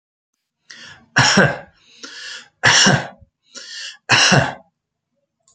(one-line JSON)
{"three_cough_length": "5.5 s", "three_cough_amplitude": 30902, "three_cough_signal_mean_std_ratio": 0.41, "survey_phase": "alpha (2021-03-01 to 2021-08-12)", "age": "45-64", "gender": "Male", "wearing_mask": "No", "symptom_none": true, "smoker_status": "Never smoked", "respiratory_condition_asthma": false, "respiratory_condition_other": false, "recruitment_source": "REACT", "submission_delay": "1 day", "covid_test_result": "Negative", "covid_test_method": "RT-qPCR"}